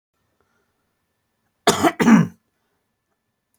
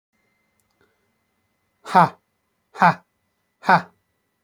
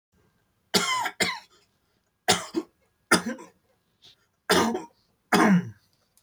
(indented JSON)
{
  "cough_length": "3.6 s",
  "cough_amplitude": 26271,
  "cough_signal_mean_std_ratio": 0.28,
  "exhalation_length": "4.4 s",
  "exhalation_amplitude": 28779,
  "exhalation_signal_mean_std_ratio": 0.23,
  "three_cough_length": "6.2 s",
  "three_cough_amplitude": 20387,
  "three_cough_signal_mean_std_ratio": 0.39,
  "survey_phase": "beta (2021-08-13 to 2022-03-07)",
  "age": "18-44",
  "gender": "Male",
  "wearing_mask": "No",
  "symptom_runny_or_blocked_nose": true,
  "smoker_status": "Never smoked",
  "respiratory_condition_asthma": true,
  "respiratory_condition_other": false,
  "recruitment_source": "REACT",
  "submission_delay": "8 days",
  "covid_test_result": "Negative",
  "covid_test_method": "RT-qPCR",
  "influenza_a_test_result": "Unknown/Void",
  "influenza_b_test_result": "Unknown/Void"
}